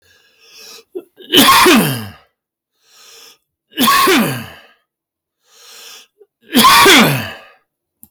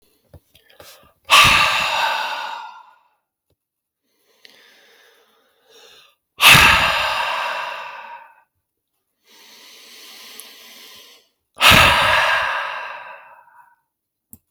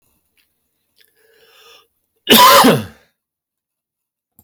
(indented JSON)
{
  "three_cough_length": "8.1 s",
  "three_cough_amplitude": 32768,
  "three_cough_signal_mean_std_ratio": 0.46,
  "exhalation_length": "14.5 s",
  "exhalation_amplitude": 32768,
  "exhalation_signal_mean_std_ratio": 0.39,
  "cough_length": "4.4 s",
  "cough_amplitude": 32768,
  "cough_signal_mean_std_ratio": 0.31,
  "survey_phase": "beta (2021-08-13 to 2022-03-07)",
  "age": "18-44",
  "gender": "Male",
  "wearing_mask": "No",
  "symptom_runny_or_blocked_nose": true,
  "smoker_status": "Ex-smoker",
  "respiratory_condition_asthma": false,
  "respiratory_condition_other": false,
  "recruitment_source": "REACT",
  "submission_delay": "0 days",
  "covid_test_result": "Negative",
  "covid_test_method": "RT-qPCR",
  "influenza_a_test_result": "Negative",
  "influenza_b_test_result": "Negative"
}